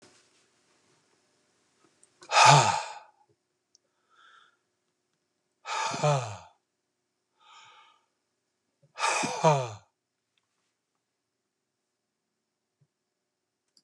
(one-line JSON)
{"exhalation_length": "13.8 s", "exhalation_amplitude": 20523, "exhalation_signal_mean_std_ratio": 0.25, "survey_phase": "beta (2021-08-13 to 2022-03-07)", "age": "45-64", "gender": "Male", "wearing_mask": "No", "symptom_cough_any": true, "symptom_onset": "12 days", "smoker_status": "Never smoked", "respiratory_condition_asthma": false, "respiratory_condition_other": false, "recruitment_source": "REACT", "submission_delay": "1 day", "covid_test_result": "Negative", "covid_test_method": "RT-qPCR"}